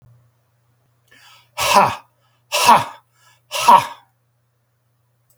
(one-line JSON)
{"exhalation_length": "5.4 s", "exhalation_amplitude": 32768, "exhalation_signal_mean_std_ratio": 0.32, "survey_phase": "beta (2021-08-13 to 2022-03-07)", "age": "45-64", "gender": "Male", "wearing_mask": "No", "symptom_none": true, "smoker_status": "Never smoked", "respiratory_condition_asthma": false, "respiratory_condition_other": false, "recruitment_source": "REACT", "submission_delay": "1 day", "covid_test_result": "Negative", "covid_test_method": "RT-qPCR", "influenza_a_test_result": "Negative", "influenza_b_test_result": "Negative"}